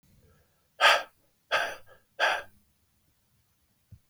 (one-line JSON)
{"exhalation_length": "4.1 s", "exhalation_amplitude": 15704, "exhalation_signal_mean_std_ratio": 0.3, "survey_phase": "beta (2021-08-13 to 2022-03-07)", "age": "18-44", "gender": "Male", "wearing_mask": "No", "symptom_runny_or_blocked_nose": true, "symptom_fatigue": true, "smoker_status": "Never smoked", "respiratory_condition_asthma": false, "respiratory_condition_other": false, "recruitment_source": "Test and Trace", "submission_delay": "0 days", "covid_test_result": "Negative", "covid_test_method": "LFT"}